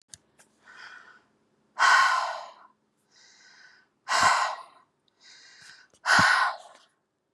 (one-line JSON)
{"exhalation_length": "7.3 s", "exhalation_amplitude": 17207, "exhalation_signal_mean_std_ratio": 0.39, "survey_phase": "beta (2021-08-13 to 2022-03-07)", "age": "45-64", "gender": "Female", "wearing_mask": "No", "symptom_none": true, "smoker_status": "Ex-smoker", "respiratory_condition_asthma": false, "respiratory_condition_other": false, "recruitment_source": "REACT", "submission_delay": "7 days", "covid_test_result": "Negative", "covid_test_method": "RT-qPCR", "influenza_a_test_result": "Negative", "influenza_b_test_result": "Negative"}